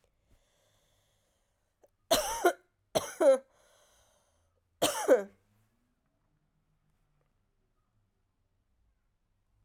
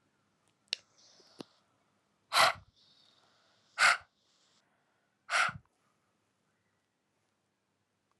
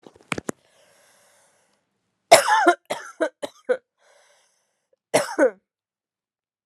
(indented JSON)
{
  "three_cough_length": "9.6 s",
  "three_cough_amplitude": 8903,
  "three_cough_signal_mean_std_ratio": 0.24,
  "exhalation_length": "8.2 s",
  "exhalation_amplitude": 7936,
  "exhalation_signal_mean_std_ratio": 0.22,
  "cough_length": "6.7 s",
  "cough_amplitude": 32768,
  "cough_signal_mean_std_ratio": 0.27,
  "survey_phase": "alpha (2021-03-01 to 2021-08-12)",
  "age": "18-44",
  "gender": "Female",
  "wearing_mask": "No",
  "symptom_cough_any": true,
  "symptom_fever_high_temperature": true,
  "symptom_change_to_sense_of_smell_or_taste": true,
  "symptom_onset": "2 days",
  "smoker_status": "Ex-smoker",
  "respiratory_condition_asthma": true,
  "respiratory_condition_other": false,
  "recruitment_source": "Test and Trace",
  "submission_delay": "1 day",
  "covid_test_result": "Positive",
  "covid_test_method": "RT-qPCR",
  "covid_ct_value": 18.3,
  "covid_ct_gene": "ORF1ab gene",
  "covid_ct_mean": 19.3,
  "covid_viral_load": "470000 copies/ml",
  "covid_viral_load_category": "Low viral load (10K-1M copies/ml)"
}